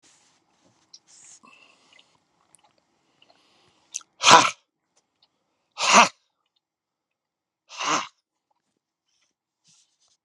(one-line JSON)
{"exhalation_length": "10.2 s", "exhalation_amplitude": 32768, "exhalation_signal_mean_std_ratio": 0.19, "survey_phase": "beta (2021-08-13 to 2022-03-07)", "age": "65+", "gender": "Male", "wearing_mask": "No", "symptom_none": true, "smoker_status": "Current smoker (1 to 10 cigarettes per day)", "respiratory_condition_asthma": false, "respiratory_condition_other": false, "recruitment_source": "REACT", "submission_delay": "2 days", "covid_test_result": "Negative", "covid_test_method": "RT-qPCR"}